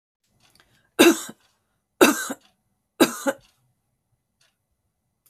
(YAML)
three_cough_length: 5.3 s
three_cough_amplitude: 31189
three_cough_signal_mean_std_ratio: 0.25
survey_phase: beta (2021-08-13 to 2022-03-07)
age: 65+
gender: Female
wearing_mask: 'No'
symptom_cough_any: true
smoker_status: Never smoked
respiratory_condition_asthma: false
respiratory_condition_other: false
recruitment_source: REACT
submission_delay: 6 days
covid_test_result: Negative
covid_test_method: RT-qPCR
influenza_a_test_result: Unknown/Void
influenza_b_test_result: Unknown/Void